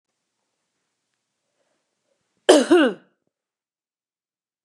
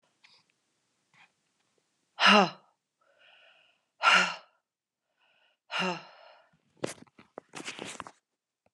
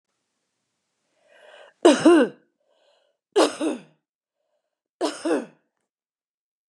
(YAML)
cough_length: 4.6 s
cough_amplitude: 32254
cough_signal_mean_std_ratio: 0.23
exhalation_length: 8.7 s
exhalation_amplitude: 16960
exhalation_signal_mean_std_ratio: 0.25
three_cough_length: 6.7 s
three_cough_amplitude: 27515
three_cough_signal_mean_std_ratio: 0.29
survey_phase: beta (2021-08-13 to 2022-03-07)
age: 45-64
gender: Female
wearing_mask: 'No'
symptom_runny_or_blocked_nose: true
symptom_sore_throat: true
symptom_fatigue: true
symptom_onset: 5 days
smoker_status: Never smoked
respiratory_condition_asthma: false
respiratory_condition_other: false
recruitment_source: REACT
submission_delay: 1 day
covid_test_result: Negative
covid_test_method: RT-qPCR
influenza_a_test_result: Negative
influenza_b_test_result: Negative